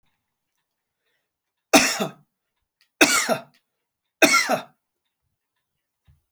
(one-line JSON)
{"three_cough_length": "6.3 s", "three_cough_amplitude": 31604, "three_cough_signal_mean_std_ratio": 0.29, "survey_phase": "alpha (2021-03-01 to 2021-08-12)", "age": "45-64", "gender": "Male", "wearing_mask": "No", "symptom_none": true, "smoker_status": "Never smoked", "respiratory_condition_asthma": false, "respiratory_condition_other": false, "recruitment_source": "REACT", "submission_delay": "1 day", "covid_test_result": "Negative", "covid_test_method": "RT-qPCR"}